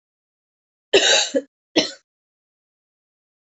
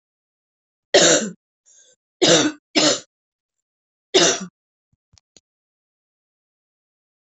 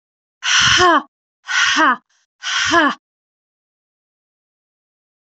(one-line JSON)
{"cough_length": "3.6 s", "cough_amplitude": 24300, "cough_signal_mean_std_ratio": 0.3, "three_cough_length": "7.3 s", "three_cough_amplitude": 27094, "three_cough_signal_mean_std_ratio": 0.31, "exhalation_length": "5.2 s", "exhalation_amplitude": 32147, "exhalation_signal_mean_std_ratio": 0.45, "survey_phase": "beta (2021-08-13 to 2022-03-07)", "age": "18-44", "gender": "Female", "wearing_mask": "No", "symptom_cough_any": true, "symptom_new_continuous_cough": true, "symptom_runny_or_blocked_nose": true, "symptom_sore_throat": true, "symptom_abdominal_pain": true, "symptom_headache": true, "symptom_change_to_sense_of_smell_or_taste": true, "symptom_onset": "2 days", "smoker_status": "Never smoked", "respiratory_condition_asthma": false, "respiratory_condition_other": false, "recruitment_source": "Test and Trace", "submission_delay": "1 day", "covid_test_result": "Positive", "covid_test_method": "RT-qPCR", "covid_ct_value": 20.9, "covid_ct_gene": "ORF1ab gene", "covid_ct_mean": 21.2, "covid_viral_load": "110000 copies/ml", "covid_viral_load_category": "Low viral load (10K-1M copies/ml)"}